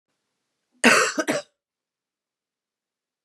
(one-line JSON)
{"three_cough_length": "3.2 s", "three_cough_amplitude": 29420, "three_cough_signal_mean_std_ratio": 0.28, "survey_phase": "beta (2021-08-13 to 2022-03-07)", "age": "45-64", "gender": "Female", "wearing_mask": "No", "symptom_cough_any": true, "symptom_onset": "4 days", "smoker_status": "Never smoked", "respiratory_condition_asthma": false, "respiratory_condition_other": false, "recruitment_source": "Test and Trace", "submission_delay": "2 days", "covid_test_result": "Positive", "covid_test_method": "RT-qPCR", "covid_ct_value": 23.1, "covid_ct_gene": "ORF1ab gene"}